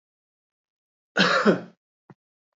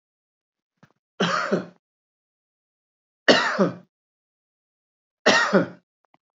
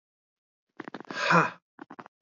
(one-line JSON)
{"cough_length": "2.6 s", "cough_amplitude": 17770, "cough_signal_mean_std_ratio": 0.32, "three_cough_length": "6.4 s", "three_cough_amplitude": 27084, "three_cough_signal_mean_std_ratio": 0.32, "exhalation_length": "2.2 s", "exhalation_amplitude": 11170, "exhalation_signal_mean_std_ratio": 0.32, "survey_phase": "beta (2021-08-13 to 2022-03-07)", "age": "45-64", "gender": "Male", "wearing_mask": "No", "symptom_none": true, "symptom_onset": "4 days", "smoker_status": "Never smoked", "respiratory_condition_asthma": false, "respiratory_condition_other": false, "recruitment_source": "REACT", "submission_delay": "4 days", "covid_test_result": "Negative", "covid_test_method": "RT-qPCR", "influenza_a_test_result": "Unknown/Void", "influenza_b_test_result": "Unknown/Void"}